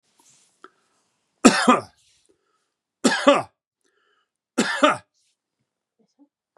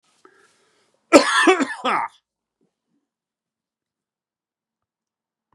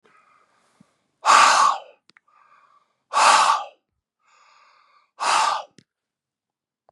{"three_cough_length": "6.6 s", "three_cough_amplitude": 32767, "three_cough_signal_mean_std_ratio": 0.28, "cough_length": "5.5 s", "cough_amplitude": 32768, "cough_signal_mean_std_ratio": 0.26, "exhalation_length": "6.9 s", "exhalation_amplitude": 30947, "exhalation_signal_mean_std_ratio": 0.36, "survey_phase": "beta (2021-08-13 to 2022-03-07)", "age": "45-64", "gender": "Male", "wearing_mask": "No", "symptom_none": true, "smoker_status": "Ex-smoker", "respiratory_condition_asthma": false, "respiratory_condition_other": false, "recruitment_source": "REACT", "submission_delay": "2 days", "covid_test_result": "Negative", "covid_test_method": "RT-qPCR", "influenza_a_test_result": "Negative", "influenza_b_test_result": "Negative"}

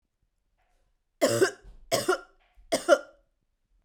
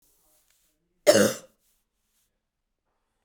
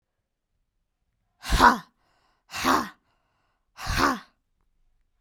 {"three_cough_length": "3.8 s", "three_cough_amplitude": 16258, "three_cough_signal_mean_std_ratio": 0.33, "cough_length": "3.2 s", "cough_amplitude": 20647, "cough_signal_mean_std_ratio": 0.22, "exhalation_length": "5.2 s", "exhalation_amplitude": 24824, "exhalation_signal_mean_std_ratio": 0.3, "survey_phase": "beta (2021-08-13 to 2022-03-07)", "age": "18-44", "gender": "Female", "wearing_mask": "No", "symptom_runny_or_blocked_nose": true, "symptom_sore_throat": true, "symptom_fatigue": true, "symptom_headache": true, "symptom_other": true, "symptom_onset": "3 days", "smoker_status": "Never smoked", "respiratory_condition_asthma": false, "respiratory_condition_other": false, "recruitment_source": "Test and Trace", "submission_delay": "1 day", "covid_test_result": "Positive", "covid_test_method": "ePCR"}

